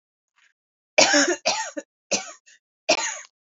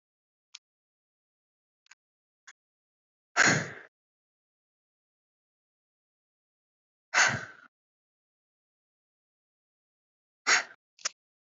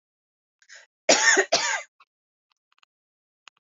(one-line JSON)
{"three_cough_length": "3.6 s", "three_cough_amplitude": 27193, "three_cough_signal_mean_std_ratio": 0.39, "exhalation_length": "11.5 s", "exhalation_amplitude": 11547, "exhalation_signal_mean_std_ratio": 0.19, "cough_length": "3.8 s", "cough_amplitude": 28056, "cough_signal_mean_std_ratio": 0.31, "survey_phase": "beta (2021-08-13 to 2022-03-07)", "age": "18-44", "gender": "Female", "wearing_mask": "Yes", "symptom_cough_any": true, "symptom_new_continuous_cough": true, "symptom_runny_or_blocked_nose": true, "symptom_shortness_of_breath": true, "symptom_sore_throat": true, "symptom_fatigue": true, "symptom_other": true, "smoker_status": "Never smoked", "respiratory_condition_asthma": false, "respiratory_condition_other": false, "recruitment_source": "Test and Trace", "submission_delay": "1 day", "covid_test_result": "Positive", "covid_test_method": "RT-qPCR", "covid_ct_value": 19.9, "covid_ct_gene": "ORF1ab gene", "covid_ct_mean": 20.0, "covid_viral_load": "280000 copies/ml", "covid_viral_load_category": "Low viral load (10K-1M copies/ml)"}